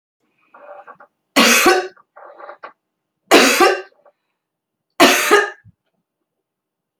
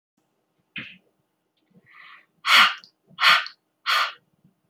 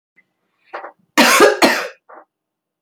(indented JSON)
{
  "three_cough_length": "7.0 s",
  "three_cough_amplitude": 32525,
  "three_cough_signal_mean_std_ratio": 0.37,
  "exhalation_length": "4.7 s",
  "exhalation_amplitude": 26203,
  "exhalation_signal_mean_std_ratio": 0.31,
  "cough_length": "2.8 s",
  "cough_amplitude": 31806,
  "cough_signal_mean_std_ratio": 0.39,
  "survey_phase": "beta (2021-08-13 to 2022-03-07)",
  "age": "45-64",
  "gender": "Female",
  "wearing_mask": "No",
  "symptom_none": true,
  "smoker_status": "Never smoked",
  "respiratory_condition_asthma": false,
  "respiratory_condition_other": false,
  "recruitment_source": "REACT",
  "submission_delay": "1 day",
  "covid_test_result": "Negative",
  "covid_test_method": "RT-qPCR"
}